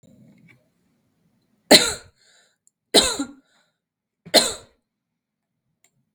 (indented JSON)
{
  "three_cough_length": "6.1 s",
  "three_cough_amplitude": 32768,
  "three_cough_signal_mean_std_ratio": 0.23,
  "survey_phase": "beta (2021-08-13 to 2022-03-07)",
  "age": "18-44",
  "gender": "Female",
  "wearing_mask": "No",
  "symptom_none": true,
  "smoker_status": "Never smoked",
  "respiratory_condition_asthma": true,
  "respiratory_condition_other": false,
  "recruitment_source": "REACT",
  "submission_delay": "2 days",
  "covid_test_result": "Negative",
  "covid_test_method": "RT-qPCR",
  "influenza_a_test_result": "Negative",
  "influenza_b_test_result": "Negative"
}